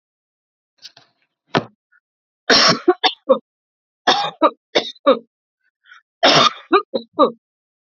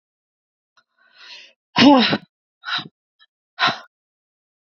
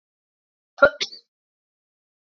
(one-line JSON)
{"three_cough_length": "7.9 s", "three_cough_amplitude": 30390, "three_cough_signal_mean_std_ratio": 0.35, "exhalation_length": "4.7 s", "exhalation_amplitude": 29973, "exhalation_signal_mean_std_ratio": 0.29, "cough_length": "2.4 s", "cough_amplitude": 27804, "cough_signal_mean_std_ratio": 0.16, "survey_phase": "beta (2021-08-13 to 2022-03-07)", "age": "45-64", "gender": "Female", "wearing_mask": "No", "symptom_sore_throat": true, "symptom_onset": "3 days", "smoker_status": "Never smoked", "respiratory_condition_asthma": false, "respiratory_condition_other": false, "recruitment_source": "Test and Trace", "submission_delay": "2 days", "covid_test_result": "Positive", "covid_test_method": "RT-qPCR", "covid_ct_value": 16.1, "covid_ct_gene": "N gene"}